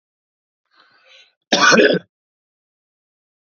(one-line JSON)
{"cough_length": "3.6 s", "cough_amplitude": 30970, "cough_signal_mean_std_ratio": 0.29, "survey_phase": "alpha (2021-03-01 to 2021-08-12)", "age": "45-64", "gender": "Male", "wearing_mask": "No", "symptom_headache": true, "symptom_onset": "2 days", "smoker_status": "Ex-smoker", "respiratory_condition_asthma": false, "respiratory_condition_other": false, "recruitment_source": "Test and Trace", "submission_delay": "2 days", "covid_test_result": "Positive", "covid_test_method": "RT-qPCR", "covid_ct_value": 14.0, "covid_ct_gene": "ORF1ab gene", "covid_ct_mean": 14.4, "covid_viral_load": "19000000 copies/ml", "covid_viral_load_category": "High viral load (>1M copies/ml)"}